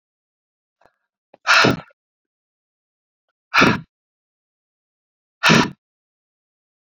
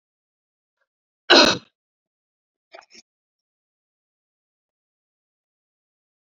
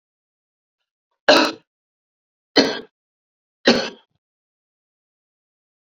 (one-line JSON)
{"exhalation_length": "7.0 s", "exhalation_amplitude": 30287, "exhalation_signal_mean_std_ratio": 0.26, "cough_length": "6.4 s", "cough_amplitude": 31335, "cough_signal_mean_std_ratio": 0.15, "three_cough_length": "5.8 s", "three_cough_amplitude": 32768, "three_cough_signal_mean_std_ratio": 0.24, "survey_phase": "beta (2021-08-13 to 2022-03-07)", "age": "45-64", "gender": "Female", "wearing_mask": "No", "symptom_cough_any": true, "symptom_runny_or_blocked_nose": true, "symptom_shortness_of_breath": true, "symptom_sore_throat": true, "symptom_fatigue": true, "symptom_headache": true, "symptom_change_to_sense_of_smell_or_taste": true, "symptom_onset": "3 days", "smoker_status": "Ex-smoker", "respiratory_condition_asthma": true, "respiratory_condition_other": false, "recruitment_source": "Test and Trace", "submission_delay": "2 days", "covid_test_result": "Positive", "covid_test_method": "ePCR"}